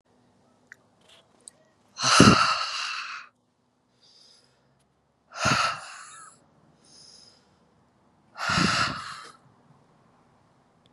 {"exhalation_length": "10.9 s", "exhalation_amplitude": 30698, "exhalation_signal_mean_std_ratio": 0.32, "survey_phase": "beta (2021-08-13 to 2022-03-07)", "age": "45-64", "gender": "Female", "wearing_mask": "No", "symptom_runny_or_blocked_nose": true, "symptom_abdominal_pain": true, "symptom_diarrhoea": true, "symptom_fatigue": true, "symptom_headache": true, "symptom_change_to_sense_of_smell_or_taste": true, "symptom_onset": "2 days", "smoker_status": "Ex-smoker", "respiratory_condition_asthma": false, "respiratory_condition_other": false, "recruitment_source": "Test and Trace", "submission_delay": "2 days", "covid_test_result": "Positive", "covid_test_method": "RT-qPCR", "covid_ct_value": 18.2, "covid_ct_gene": "ORF1ab gene", "covid_ct_mean": 18.7, "covid_viral_load": "740000 copies/ml", "covid_viral_load_category": "Low viral load (10K-1M copies/ml)"}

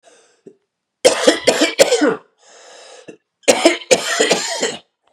{"three_cough_length": "5.1 s", "three_cough_amplitude": 32768, "three_cough_signal_mean_std_ratio": 0.47, "survey_phase": "beta (2021-08-13 to 2022-03-07)", "age": "18-44", "gender": "Male", "wearing_mask": "No", "symptom_cough_any": true, "symptom_runny_or_blocked_nose": true, "symptom_sore_throat": true, "symptom_diarrhoea": true, "symptom_fatigue": true, "symptom_headache": true, "smoker_status": "Never smoked", "respiratory_condition_asthma": true, "respiratory_condition_other": false, "recruitment_source": "Test and Trace", "submission_delay": "2 days", "covid_test_result": "Positive", "covid_test_method": "RT-qPCR", "covid_ct_value": 21.6, "covid_ct_gene": "ORF1ab gene", "covid_ct_mean": 22.1, "covid_viral_load": "54000 copies/ml", "covid_viral_load_category": "Low viral load (10K-1M copies/ml)"}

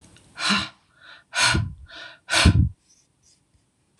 {"exhalation_length": "4.0 s", "exhalation_amplitude": 26028, "exhalation_signal_mean_std_ratio": 0.41, "survey_phase": "beta (2021-08-13 to 2022-03-07)", "age": "45-64", "gender": "Female", "wearing_mask": "No", "symptom_runny_or_blocked_nose": true, "smoker_status": "Never smoked", "respiratory_condition_asthma": false, "respiratory_condition_other": false, "recruitment_source": "REACT", "submission_delay": "1 day", "covid_test_result": "Negative", "covid_test_method": "RT-qPCR", "influenza_a_test_result": "Negative", "influenza_b_test_result": "Negative"}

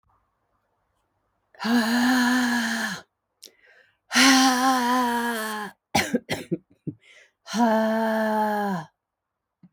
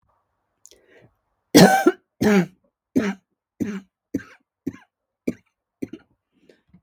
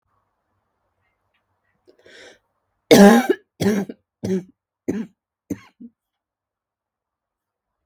{"exhalation_length": "9.7 s", "exhalation_amplitude": 20006, "exhalation_signal_mean_std_ratio": 0.61, "three_cough_length": "6.8 s", "three_cough_amplitude": 32768, "three_cough_signal_mean_std_ratio": 0.27, "cough_length": "7.9 s", "cough_amplitude": 32768, "cough_signal_mean_std_ratio": 0.24, "survey_phase": "beta (2021-08-13 to 2022-03-07)", "age": "45-64", "gender": "Female", "wearing_mask": "No", "symptom_cough_any": true, "symptom_runny_or_blocked_nose": true, "symptom_shortness_of_breath": true, "symptom_sore_throat": true, "symptom_fatigue": true, "symptom_fever_high_temperature": true, "symptom_headache": true, "symptom_change_to_sense_of_smell_or_taste": true, "symptom_loss_of_taste": true, "symptom_other": true, "symptom_onset": "4 days", "smoker_status": "Never smoked", "respiratory_condition_asthma": false, "respiratory_condition_other": false, "recruitment_source": "Test and Trace", "submission_delay": "2 days", "covid_test_result": "Positive", "covid_test_method": "RT-qPCR", "covid_ct_value": 24.8, "covid_ct_gene": "N gene"}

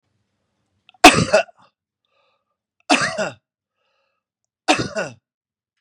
{"three_cough_length": "5.8 s", "three_cough_amplitude": 32768, "three_cough_signal_mean_std_ratio": 0.26, "survey_phase": "beta (2021-08-13 to 2022-03-07)", "age": "45-64", "gender": "Male", "wearing_mask": "No", "symptom_fatigue": true, "symptom_onset": "12 days", "smoker_status": "Ex-smoker", "respiratory_condition_asthma": false, "respiratory_condition_other": false, "recruitment_source": "REACT", "submission_delay": "9 days", "covid_test_result": "Negative", "covid_test_method": "RT-qPCR", "influenza_a_test_result": "Negative", "influenza_b_test_result": "Negative"}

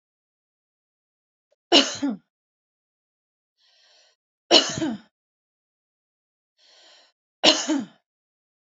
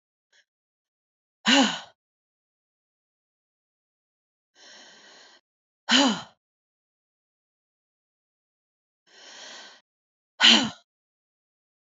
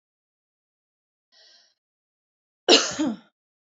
{"three_cough_length": "8.6 s", "three_cough_amplitude": 31281, "three_cough_signal_mean_std_ratio": 0.24, "exhalation_length": "11.9 s", "exhalation_amplitude": 23647, "exhalation_signal_mean_std_ratio": 0.21, "cough_length": "3.8 s", "cough_amplitude": 26330, "cough_signal_mean_std_ratio": 0.22, "survey_phase": "alpha (2021-03-01 to 2021-08-12)", "age": "45-64", "gender": "Female", "wearing_mask": "No", "symptom_none": true, "symptom_onset": "13 days", "smoker_status": "Ex-smoker", "respiratory_condition_asthma": false, "respiratory_condition_other": false, "recruitment_source": "REACT", "submission_delay": "1 day", "covid_test_result": "Negative", "covid_test_method": "RT-qPCR"}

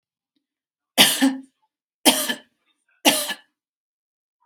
{"three_cough_length": "4.5 s", "three_cough_amplitude": 32768, "three_cough_signal_mean_std_ratio": 0.31, "survey_phase": "beta (2021-08-13 to 2022-03-07)", "age": "18-44", "gender": "Female", "wearing_mask": "No", "symptom_none": true, "smoker_status": "Never smoked", "respiratory_condition_asthma": false, "respiratory_condition_other": false, "recruitment_source": "REACT", "submission_delay": "7 days", "covid_test_result": "Negative", "covid_test_method": "RT-qPCR", "influenza_a_test_result": "Negative", "influenza_b_test_result": "Negative"}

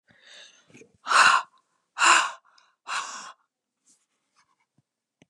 {"exhalation_length": "5.3 s", "exhalation_amplitude": 21841, "exhalation_signal_mean_std_ratio": 0.3, "survey_phase": "beta (2021-08-13 to 2022-03-07)", "age": "18-44", "gender": "Female", "wearing_mask": "No", "symptom_none": true, "smoker_status": "Never smoked", "respiratory_condition_asthma": false, "respiratory_condition_other": false, "recruitment_source": "REACT", "submission_delay": "2 days", "covid_test_result": "Negative", "covid_test_method": "RT-qPCR", "influenza_a_test_result": "Negative", "influenza_b_test_result": "Negative"}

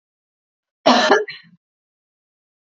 {"cough_length": "2.7 s", "cough_amplitude": 32768, "cough_signal_mean_std_ratio": 0.3, "survey_phase": "beta (2021-08-13 to 2022-03-07)", "age": "18-44", "gender": "Female", "wearing_mask": "No", "symptom_none": true, "smoker_status": "Never smoked", "respiratory_condition_asthma": false, "respiratory_condition_other": false, "recruitment_source": "REACT", "submission_delay": "1 day", "covid_test_result": "Negative", "covid_test_method": "RT-qPCR"}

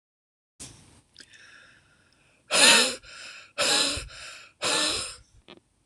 {"exhalation_length": "5.9 s", "exhalation_amplitude": 21513, "exhalation_signal_mean_std_ratio": 0.39, "survey_phase": "beta (2021-08-13 to 2022-03-07)", "age": "65+", "gender": "Female", "wearing_mask": "No", "symptom_runny_or_blocked_nose": true, "smoker_status": "Never smoked", "respiratory_condition_asthma": true, "respiratory_condition_other": false, "recruitment_source": "REACT", "submission_delay": "2 days", "covid_test_result": "Negative", "covid_test_method": "RT-qPCR"}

